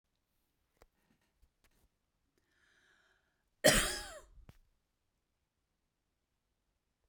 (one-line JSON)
{"cough_length": "7.1 s", "cough_amplitude": 8760, "cough_signal_mean_std_ratio": 0.17, "survey_phase": "beta (2021-08-13 to 2022-03-07)", "age": "45-64", "gender": "Female", "wearing_mask": "No", "symptom_none": true, "smoker_status": "Never smoked", "respiratory_condition_asthma": false, "respiratory_condition_other": false, "recruitment_source": "REACT", "submission_delay": "1 day", "covid_test_result": "Negative", "covid_test_method": "RT-qPCR", "influenza_a_test_result": "Negative", "influenza_b_test_result": "Negative"}